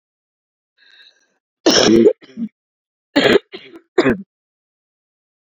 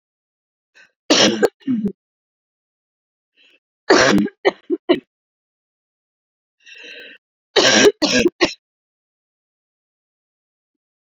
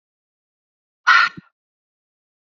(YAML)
cough_length: 5.5 s
cough_amplitude: 32768
cough_signal_mean_std_ratio: 0.33
three_cough_length: 11.0 s
three_cough_amplitude: 32519
three_cough_signal_mean_std_ratio: 0.33
exhalation_length: 2.6 s
exhalation_amplitude: 29357
exhalation_signal_mean_std_ratio: 0.23
survey_phase: beta (2021-08-13 to 2022-03-07)
age: 45-64
gender: Female
wearing_mask: 'No'
symptom_cough_any: true
symptom_headache: true
symptom_change_to_sense_of_smell_or_taste: true
symptom_loss_of_taste: true
symptom_other: true
symptom_onset: 3 days
smoker_status: Never smoked
respiratory_condition_asthma: false
respiratory_condition_other: false
recruitment_source: Test and Trace
submission_delay: 2 days
covid_test_result: Positive
covid_test_method: RT-qPCR